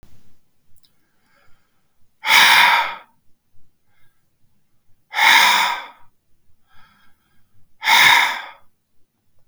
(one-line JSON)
{"exhalation_length": "9.5 s", "exhalation_amplitude": 32768, "exhalation_signal_mean_std_ratio": 0.38, "survey_phase": "beta (2021-08-13 to 2022-03-07)", "age": "65+", "gender": "Male", "wearing_mask": "No", "symptom_runny_or_blocked_nose": true, "smoker_status": "Never smoked", "respiratory_condition_asthma": false, "respiratory_condition_other": false, "recruitment_source": "REACT", "submission_delay": "3 days", "covid_test_result": "Negative", "covid_test_method": "RT-qPCR", "influenza_a_test_result": "Negative", "influenza_b_test_result": "Negative"}